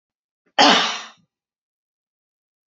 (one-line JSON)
{"cough_length": "2.7 s", "cough_amplitude": 30117, "cough_signal_mean_std_ratio": 0.28, "survey_phase": "beta (2021-08-13 to 2022-03-07)", "age": "65+", "gender": "Female", "wearing_mask": "No", "symptom_none": true, "smoker_status": "Never smoked", "respiratory_condition_asthma": false, "respiratory_condition_other": false, "recruitment_source": "REACT", "submission_delay": "1 day", "covid_test_result": "Negative", "covid_test_method": "RT-qPCR"}